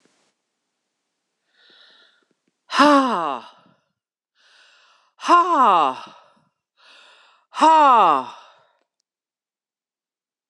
{"exhalation_length": "10.5 s", "exhalation_amplitude": 26028, "exhalation_signal_mean_std_ratio": 0.34, "survey_phase": "beta (2021-08-13 to 2022-03-07)", "age": "65+", "gender": "Female", "wearing_mask": "No", "symptom_cough_any": true, "symptom_runny_or_blocked_nose": true, "symptom_fatigue": true, "symptom_headache": true, "symptom_onset": "2 days", "smoker_status": "Never smoked", "respiratory_condition_asthma": false, "respiratory_condition_other": false, "recruitment_source": "Test and Trace", "submission_delay": "2 days", "covid_test_result": "Positive", "covid_test_method": "RT-qPCR", "covid_ct_value": 34.2, "covid_ct_gene": "ORF1ab gene", "covid_ct_mean": 35.7, "covid_viral_load": "2 copies/ml", "covid_viral_load_category": "Minimal viral load (< 10K copies/ml)"}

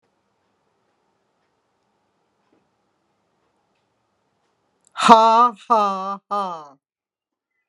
{"exhalation_length": "7.7 s", "exhalation_amplitude": 32768, "exhalation_signal_mean_std_ratio": 0.28, "survey_phase": "alpha (2021-03-01 to 2021-08-12)", "age": "45-64", "gender": "Female", "wearing_mask": "No", "symptom_none": true, "smoker_status": "Never smoked", "respiratory_condition_asthma": false, "respiratory_condition_other": false, "recruitment_source": "REACT", "submission_delay": "1 day", "covid_test_result": "Negative", "covid_test_method": "RT-qPCR"}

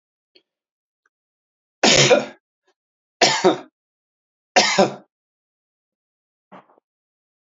{"three_cough_length": "7.4 s", "three_cough_amplitude": 32767, "three_cough_signal_mean_std_ratio": 0.29, "survey_phase": "beta (2021-08-13 to 2022-03-07)", "age": "45-64", "gender": "Male", "wearing_mask": "No", "symptom_runny_or_blocked_nose": true, "symptom_fatigue": true, "smoker_status": "Never smoked", "respiratory_condition_asthma": false, "respiratory_condition_other": false, "recruitment_source": "Test and Trace", "submission_delay": "2 days", "covid_test_result": "Positive", "covid_test_method": "RT-qPCR", "covid_ct_value": 18.8, "covid_ct_gene": "ORF1ab gene", "covid_ct_mean": 19.0, "covid_viral_load": "580000 copies/ml", "covid_viral_load_category": "Low viral load (10K-1M copies/ml)"}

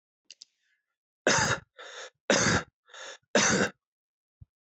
{"three_cough_length": "4.7 s", "three_cough_amplitude": 11537, "three_cough_signal_mean_std_ratio": 0.39, "survey_phase": "alpha (2021-03-01 to 2021-08-12)", "age": "45-64", "gender": "Male", "wearing_mask": "No", "symptom_none": true, "smoker_status": "Ex-smoker", "respiratory_condition_asthma": false, "respiratory_condition_other": false, "recruitment_source": "REACT", "submission_delay": "2 days", "covid_test_result": "Negative", "covid_test_method": "RT-qPCR"}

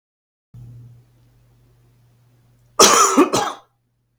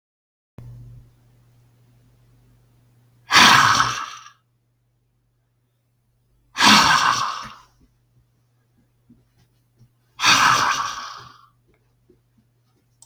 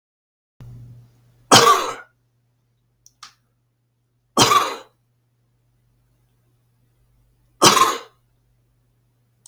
{"cough_length": "4.2 s", "cough_amplitude": 32768, "cough_signal_mean_std_ratio": 0.32, "exhalation_length": "13.1 s", "exhalation_amplitude": 32768, "exhalation_signal_mean_std_ratio": 0.33, "three_cough_length": "9.5 s", "three_cough_amplitude": 32768, "three_cough_signal_mean_std_ratio": 0.26, "survey_phase": "beta (2021-08-13 to 2022-03-07)", "age": "45-64", "gender": "Male", "wearing_mask": "No", "symptom_none": true, "smoker_status": "Never smoked", "respiratory_condition_asthma": false, "respiratory_condition_other": false, "recruitment_source": "REACT", "submission_delay": "1 day", "covid_test_result": "Negative", "covid_test_method": "RT-qPCR", "influenza_a_test_result": "Negative", "influenza_b_test_result": "Negative"}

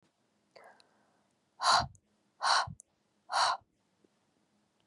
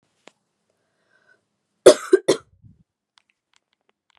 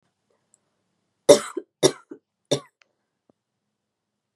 {"exhalation_length": "4.9 s", "exhalation_amplitude": 7665, "exhalation_signal_mean_std_ratio": 0.32, "cough_length": "4.2 s", "cough_amplitude": 32768, "cough_signal_mean_std_ratio": 0.16, "three_cough_length": "4.4 s", "three_cough_amplitude": 32767, "three_cough_signal_mean_std_ratio": 0.17, "survey_phase": "beta (2021-08-13 to 2022-03-07)", "age": "18-44", "gender": "Female", "wearing_mask": "No", "symptom_runny_or_blocked_nose": true, "smoker_status": "Never smoked", "respiratory_condition_asthma": false, "respiratory_condition_other": false, "recruitment_source": "Test and Trace", "submission_delay": "1 day", "covid_test_result": "Positive", "covid_test_method": "ePCR"}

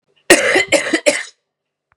{"cough_length": "2.0 s", "cough_amplitude": 32768, "cough_signal_mean_std_ratio": 0.47, "survey_phase": "beta (2021-08-13 to 2022-03-07)", "age": "45-64", "gender": "Female", "wearing_mask": "No", "symptom_cough_any": true, "symptom_runny_or_blocked_nose": true, "symptom_fatigue": true, "symptom_headache": true, "symptom_change_to_sense_of_smell_or_taste": true, "symptom_onset": "3 days", "smoker_status": "Never smoked", "respiratory_condition_asthma": false, "respiratory_condition_other": false, "recruitment_source": "Test and Trace", "submission_delay": "2 days", "covid_test_result": "Positive", "covid_test_method": "RT-qPCR", "covid_ct_value": 25.4, "covid_ct_gene": "ORF1ab gene"}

